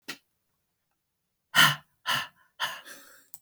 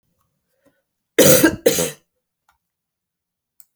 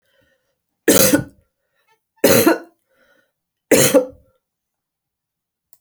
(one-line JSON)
{"exhalation_length": "3.4 s", "exhalation_amplitude": 18214, "exhalation_signal_mean_std_ratio": 0.28, "cough_length": "3.8 s", "cough_amplitude": 32768, "cough_signal_mean_std_ratio": 0.29, "three_cough_length": "5.8 s", "three_cough_amplitude": 32768, "three_cough_signal_mean_std_ratio": 0.33, "survey_phase": "beta (2021-08-13 to 2022-03-07)", "age": "45-64", "gender": "Female", "wearing_mask": "No", "symptom_cough_any": true, "symptom_runny_or_blocked_nose": true, "symptom_shortness_of_breath": true, "symptom_headache": true, "symptom_onset": "7 days", "smoker_status": "Never smoked", "respiratory_condition_asthma": false, "respiratory_condition_other": false, "recruitment_source": "Test and Trace", "submission_delay": "3 days", "covid_test_result": "Positive", "covid_test_method": "RT-qPCR", "covid_ct_value": 18.1, "covid_ct_gene": "ORF1ab gene", "covid_ct_mean": 18.3, "covid_viral_load": "1000000 copies/ml", "covid_viral_load_category": "Low viral load (10K-1M copies/ml)"}